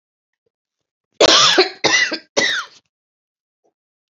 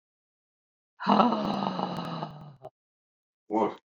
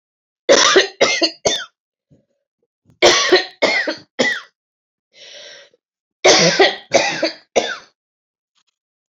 cough_length: 4.1 s
cough_amplitude: 32203
cough_signal_mean_std_ratio: 0.39
exhalation_length: 3.8 s
exhalation_amplitude: 14151
exhalation_signal_mean_std_ratio: 0.45
three_cough_length: 9.1 s
three_cough_amplitude: 32196
three_cough_signal_mean_std_ratio: 0.43
survey_phase: beta (2021-08-13 to 2022-03-07)
age: 45-64
gender: Female
wearing_mask: 'No'
symptom_cough_any: true
symptom_runny_or_blocked_nose: true
symptom_sore_throat: true
symptom_diarrhoea: true
symptom_fatigue: true
symptom_headache: true
smoker_status: Ex-smoker
respiratory_condition_asthma: false
respiratory_condition_other: false
recruitment_source: Test and Trace
submission_delay: 2 days
covid_test_result: Positive
covid_test_method: RT-qPCR
covid_ct_value: 27.0
covid_ct_gene: ORF1ab gene
covid_ct_mean: 28.1
covid_viral_load: 600 copies/ml
covid_viral_load_category: Minimal viral load (< 10K copies/ml)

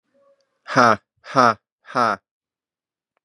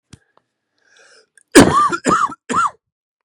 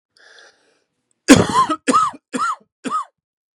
exhalation_length: 3.2 s
exhalation_amplitude: 32429
exhalation_signal_mean_std_ratio: 0.31
cough_length: 3.2 s
cough_amplitude: 32768
cough_signal_mean_std_ratio: 0.38
three_cough_length: 3.6 s
three_cough_amplitude: 32768
three_cough_signal_mean_std_ratio: 0.38
survey_phase: beta (2021-08-13 to 2022-03-07)
age: 18-44
gender: Male
wearing_mask: 'No'
symptom_runny_or_blocked_nose: true
symptom_sore_throat: true
symptom_fatigue: true
symptom_headache: true
symptom_onset: 3 days
smoker_status: Ex-smoker
respiratory_condition_asthma: true
respiratory_condition_other: false
recruitment_source: Test and Trace
submission_delay: 2 days
covid_test_result: Positive
covid_test_method: RT-qPCR
covid_ct_value: 20.2
covid_ct_gene: ORF1ab gene
covid_ct_mean: 21.0
covid_viral_load: 130000 copies/ml
covid_viral_load_category: Low viral load (10K-1M copies/ml)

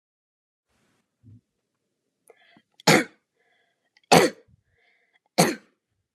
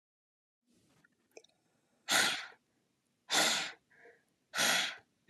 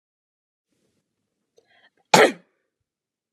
three_cough_length: 6.1 s
three_cough_amplitude: 30883
three_cough_signal_mean_std_ratio: 0.21
exhalation_length: 5.3 s
exhalation_amplitude: 5758
exhalation_signal_mean_std_ratio: 0.37
cough_length: 3.3 s
cough_amplitude: 32765
cough_signal_mean_std_ratio: 0.17
survey_phase: alpha (2021-03-01 to 2021-08-12)
age: 18-44
gender: Female
wearing_mask: 'No'
symptom_none: true
smoker_status: Never smoked
respiratory_condition_asthma: false
respiratory_condition_other: false
recruitment_source: REACT
submission_delay: 1 day
covid_test_result: Negative
covid_test_method: RT-qPCR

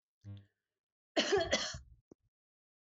cough_length: 3.0 s
cough_amplitude: 3751
cough_signal_mean_std_ratio: 0.35
survey_phase: beta (2021-08-13 to 2022-03-07)
age: 45-64
gender: Female
wearing_mask: 'No'
symptom_none: true
smoker_status: Never smoked
respiratory_condition_asthma: true
respiratory_condition_other: false
recruitment_source: REACT
submission_delay: 1 day
covid_test_result: Negative
covid_test_method: RT-qPCR
influenza_a_test_result: Negative
influenza_b_test_result: Negative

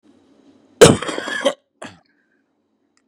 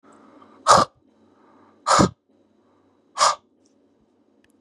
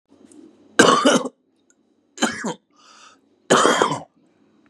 cough_length: 3.1 s
cough_amplitude: 32768
cough_signal_mean_std_ratio: 0.26
exhalation_length: 4.6 s
exhalation_amplitude: 28672
exhalation_signal_mean_std_ratio: 0.28
three_cough_length: 4.7 s
three_cough_amplitude: 32768
three_cough_signal_mean_std_ratio: 0.39
survey_phase: beta (2021-08-13 to 2022-03-07)
age: 45-64
gender: Male
wearing_mask: 'No'
symptom_diarrhoea: true
symptom_headache: true
smoker_status: Current smoker (1 to 10 cigarettes per day)
respiratory_condition_asthma: false
respiratory_condition_other: false
recruitment_source: REACT
submission_delay: 5 days
covid_test_result: Negative
covid_test_method: RT-qPCR
influenza_a_test_result: Negative
influenza_b_test_result: Negative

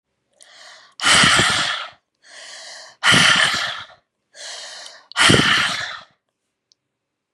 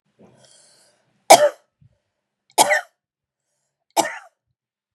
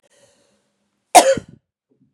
exhalation_length: 7.3 s
exhalation_amplitude: 32768
exhalation_signal_mean_std_ratio: 0.47
three_cough_length: 4.9 s
three_cough_amplitude: 32768
three_cough_signal_mean_std_ratio: 0.23
cough_length: 2.1 s
cough_amplitude: 32768
cough_signal_mean_std_ratio: 0.23
survey_phase: beta (2021-08-13 to 2022-03-07)
age: 18-44
gender: Female
wearing_mask: 'No'
symptom_none: true
smoker_status: Never smoked
respiratory_condition_asthma: false
respiratory_condition_other: false
recruitment_source: REACT
submission_delay: 1 day
covid_test_result: Negative
covid_test_method: RT-qPCR
influenza_a_test_result: Negative
influenza_b_test_result: Negative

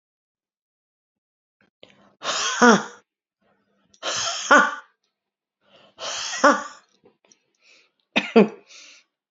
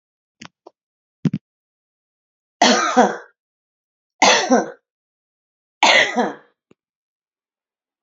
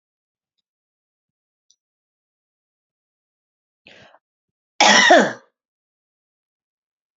exhalation_length: 9.3 s
exhalation_amplitude: 32564
exhalation_signal_mean_std_ratio: 0.3
three_cough_length: 8.0 s
three_cough_amplitude: 32767
three_cough_signal_mean_std_ratio: 0.33
cough_length: 7.2 s
cough_amplitude: 31419
cough_signal_mean_std_ratio: 0.21
survey_phase: beta (2021-08-13 to 2022-03-07)
age: 45-64
gender: Female
wearing_mask: 'No'
symptom_runny_or_blocked_nose: true
symptom_shortness_of_breath: true
symptom_sore_throat: true
symptom_fatigue: true
symptom_onset: 12 days
smoker_status: Never smoked
respiratory_condition_asthma: false
respiratory_condition_other: false
recruitment_source: REACT
submission_delay: 6 days
covid_test_result: Negative
covid_test_method: RT-qPCR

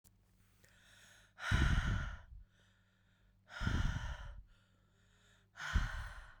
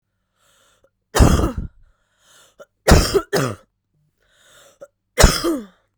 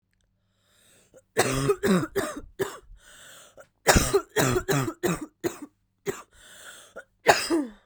exhalation_length: 6.4 s
exhalation_amplitude: 3337
exhalation_signal_mean_std_ratio: 0.45
three_cough_length: 6.0 s
three_cough_amplitude: 32768
three_cough_signal_mean_std_ratio: 0.34
cough_length: 7.9 s
cough_amplitude: 25509
cough_signal_mean_std_ratio: 0.45
survey_phase: beta (2021-08-13 to 2022-03-07)
age: 18-44
gender: Female
wearing_mask: 'No'
symptom_new_continuous_cough: true
symptom_runny_or_blocked_nose: true
symptom_sore_throat: true
symptom_diarrhoea: true
symptom_fatigue: true
symptom_fever_high_temperature: true
symptom_headache: true
smoker_status: Current smoker (11 or more cigarettes per day)
respiratory_condition_asthma: false
respiratory_condition_other: false
recruitment_source: Test and Trace
submission_delay: 2 days
covid_test_result: Positive
covid_test_method: RT-qPCR
covid_ct_value: 13.9
covid_ct_gene: ORF1ab gene
covid_ct_mean: 14.2
covid_viral_load: 21000000 copies/ml
covid_viral_load_category: High viral load (>1M copies/ml)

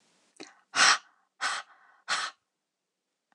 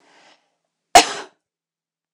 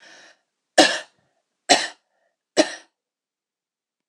exhalation_length: 3.3 s
exhalation_amplitude: 13524
exhalation_signal_mean_std_ratio: 0.31
cough_length: 2.1 s
cough_amplitude: 26028
cough_signal_mean_std_ratio: 0.19
three_cough_length: 4.1 s
three_cough_amplitude: 26028
three_cough_signal_mean_std_ratio: 0.24
survey_phase: alpha (2021-03-01 to 2021-08-12)
age: 18-44
gender: Female
wearing_mask: 'No'
symptom_none: true
smoker_status: Never smoked
respiratory_condition_asthma: false
respiratory_condition_other: false
recruitment_source: REACT
submission_delay: 1 day
covid_test_result: Negative
covid_test_method: RT-qPCR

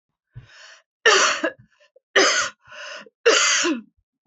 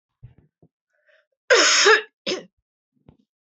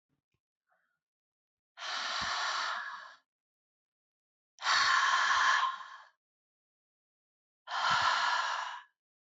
three_cough_length: 4.3 s
three_cough_amplitude: 23663
three_cough_signal_mean_std_ratio: 0.47
cough_length: 3.4 s
cough_amplitude: 23274
cough_signal_mean_std_ratio: 0.34
exhalation_length: 9.2 s
exhalation_amplitude: 6330
exhalation_signal_mean_std_ratio: 0.5
survey_phase: beta (2021-08-13 to 2022-03-07)
age: 65+
gender: Female
wearing_mask: 'No'
symptom_cough_any: true
symptom_runny_or_blocked_nose: true
symptom_change_to_sense_of_smell_or_taste: true
symptom_onset: 5 days
smoker_status: Ex-smoker
respiratory_condition_asthma: false
respiratory_condition_other: false
recruitment_source: Test and Trace
submission_delay: 2 days
covid_test_result: Positive
covid_test_method: RT-qPCR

